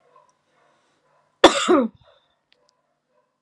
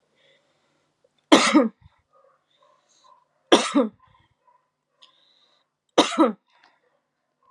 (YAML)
cough_length: 3.4 s
cough_amplitude: 32768
cough_signal_mean_std_ratio: 0.24
three_cough_length: 7.5 s
three_cough_amplitude: 32544
three_cough_signal_mean_std_ratio: 0.26
survey_phase: alpha (2021-03-01 to 2021-08-12)
age: 18-44
gender: Female
wearing_mask: 'No'
symptom_none: true
smoker_status: Never smoked
respiratory_condition_asthma: false
respiratory_condition_other: false
recruitment_source: REACT
submission_delay: 1 day
covid_test_result: Negative
covid_test_method: RT-qPCR